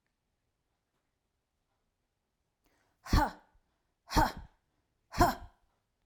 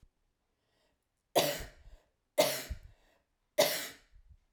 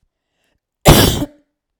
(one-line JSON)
{"exhalation_length": "6.1 s", "exhalation_amplitude": 7725, "exhalation_signal_mean_std_ratio": 0.24, "three_cough_length": "4.5 s", "three_cough_amplitude": 7805, "three_cough_signal_mean_std_ratio": 0.32, "cough_length": "1.8 s", "cough_amplitude": 32768, "cough_signal_mean_std_ratio": 0.35, "survey_phase": "beta (2021-08-13 to 2022-03-07)", "age": "18-44", "gender": "Female", "wearing_mask": "No", "symptom_cough_any": true, "symptom_runny_or_blocked_nose": true, "symptom_fatigue": true, "symptom_other": true, "symptom_onset": "2 days", "smoker_status": "Never smoked", "respiratory_condition_asthma": false, "respiratory_condition_other": false, "recruitment_source": "Test and Trace", "submission_delay": "1 day", "covid_test_result": "Negative", "covid_test_method": "ePCR"}